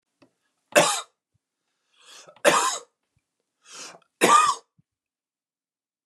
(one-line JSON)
{"three_cough_length": "6.1 s", "three_cough_amplitude": 25142, "three_cough_signal_mean_std_ratio": 0.3, "survey_phase": "beta (2021-08-13 to 2022-03-07)", "age": "45-64", "gender": "Male", "wearing_mask": "No", "symptom_none": true, "smoker_status": "Never smoked", "respiratory_condition_asthma": false, "respiratory_condition_other": false, "recruitment_source": "REACT", "submission_delay": "3 days", "covid_test_result": "Negative", "covid_test_method": "RT-qPCR"}